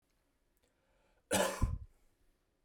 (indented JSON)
{
  "cough_length": "2.6 s",
  "cough_amplitude": 3780,
  "cough_signal_mean_std_ratio": 0.33,
  "survey_phase": "beta (2021-08-13 to 2022-03-07)",
  "age": "18-44",
  "gender": "Male",
  "wearing_mask": "No",
  "symptom_none": true,
  "smoker_status": "Never smoked",
  "respiratory_condition_asthma": false,
  "respiratory_condition_other": false,
  "recruitment_source": "REACT",
  "submission_delay": "1 day",
  "covid_test_result": "Negative",
  "covid_test_method": "RT-qPCR",
  "influenza_a_test_result": "Negative",
  "influenza_b_test_result": "Negative"
}